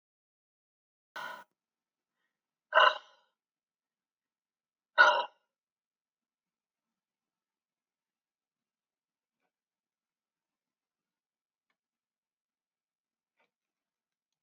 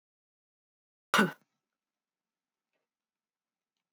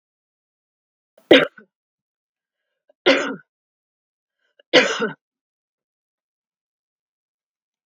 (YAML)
exhalation_length: 14.4 s
exhalation_amplitude: 13826
exhalation_signal_mean_std_ratio: 0.14
cough_length: 3.9 s
cough_amplitude: 9413
cough_signal_mean_std_ratio: 0.15
three_cough_length: 7.9 s
three_cough_amplitude: 32765
three_cough_signal_mean_std_ratio: 0.21
survey_phase: beta (2021-08-13 to 2022-03-07)
age: 65+
gender: Female
wearing_mask: 'No'
symptom_none: true
smoker_status: Ex-smoker
respiratory_condition_asthma: false
respiratory_condition_other: false
recruitment_source: REACT
submission_delay: 1 day
covid_test_result: Negative
covid_test_method: RT-qPCR
influenza_a_test_result: Negative
influenza_b_test_result: Negative